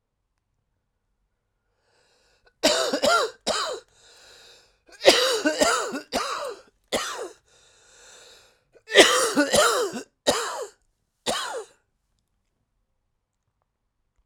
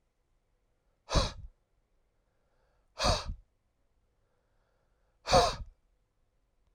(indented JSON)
{
  "three_cough_length": "14.3 s",
  "three_cough_amplitude": 32767,
  "three_cough_signal_mean_std_ratio": 0.39,
  "exhalation_length": "6.7 s",
  "exhalation_amplitude": 9055,
  "exhalation_signal_mean_std_ratio": 0.26,
  "survey_phase": "alpha (2021-03-01 to 2021-08-12)",
  "age": "45-64",
  "gender": "Male",
  "wearing_mask": "No",
  "symptom_cough_any": true,
  "symptom_shortness_of_breath": true,
  "symptom_fatigue": true,
  "symptom_headache": true,
  "smoker_status": "Ex-smoker",
  "respiratory_condition_asthma": false,
  "respiratory_condition_other": false,
  "recruitment_source": "Test and Trace",
  "submission_delay": "2 days",
  "covid_test_result": "Positive",
  "covid_test_method": "LFT"
}